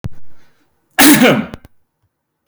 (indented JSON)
{
  "cough_length": "2.5 s",
  "cough_amplitude": 32768,
  "cough_signal_mean_std_ratio": 0.44,
  "survey_phase": "beta (2021-08-13 to 2022-03-07)",
  "age": "18-44",
  "gender": "Male",
  "wearing_mask": "No",
  "symptom_none": true,
  "smoker_status": "Never smoked",
  "respiratory_condition_asthma": false,
  "respiratory_condition_other": false,
  "recruitment_source": "REACT",
  "submission_delay": "4 days",
  "covid_test_result": "Negative",
  "covid_test_method": "RT-qPCR",
  "influenza_a_test_result": "Negative",
  "influenza_b_test_result": "Negative"
}